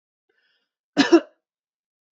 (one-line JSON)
{"cough_length": "2.1 s", "cough_amplitude": 25304, "cough_signal_mean_std_ratio": 0.22, "survey_phase": "beta (2021-08-13 to 2022-03-07)", "age": "18-44", "gender": "Male", "wearing_mask": "No", "symptom_none": true, "smoker_status": "Never smoked", "respiratory_condition_asthma": false, "respiratory_condition_other": false, "recruitment_source": "REACT", "submission_delay": "4 days", "covid_test_result": "Negative", "covid_test_method": "RT-qPCR", "influenza_a_test_result": "Negative", "influenza_b_test_result": "Negative"}